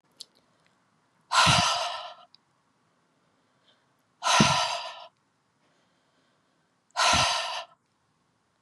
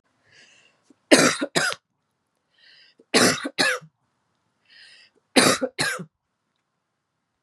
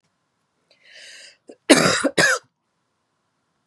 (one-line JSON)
{"exhalation_length": "8.6 s", "exhalation_amplitude": 16392, "exhalation_signal_mean_std_ratio": 0.37, "three_cough_length": "7.4 s", "three_cough_amplitude": 32767, "three_cough_signal_mean_std_ratio": 0.33, "cough_length": "3.7 s", "cough_amplitude": 32768, "cough_signal_mean_std_ratio": 0.31, "survey_phase": "beta (2021-08-13 to 2022-03-07)", "age": "45-64", "gender": "Female", "wearing_mask": "No", "symptom_runny_or_blocked_nose": true, "smoker_status": "Never smoked", "respiratory_condition_asthma": false, "respiratory_condition_other": false, "recruitment_source": "REACT", "submission_delay": "1 day", "covid_test_result": "Positive", "covid_test_method": "RT-qPCR", "covid_ct_value": 36.0, "covid_ct_gene": "N gene"}